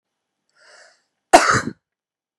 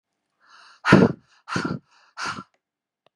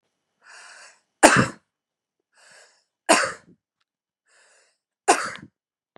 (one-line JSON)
{"cough_length": "2.4 s", "cough_amplitude": 32768, "cough_signal_mean_std_ratio": 0.25, "exhalation_length": "3.2 s", "exhalation_amplitude": 32768, "exhalation_signal_mean_std_ratio": 0.29, "three_cough_length": "6.0 s", "three_cough_amplitude": 32768, "three_cough_signal_mean_std_ratio": 0.24, "survey_phase": "beta (2021-08-13 to 2022-03-07)", "age": "18-44", "gender": "Female", "wearing_mask": "No", "symptom_none": true, "smoker_status": "Current smoker (11 or more cigarettes per day)", "respiratory_condition_asthma": true, "respiratory_condition_other": false, "recruitment_source": "REACT", "submission_delay": "3 days", "covid_test_result": "Negative", "covid_test_method": "RT-qPCR", "influenza_a_test_result": "Negative", "influenza_b_test_result": "Negative"}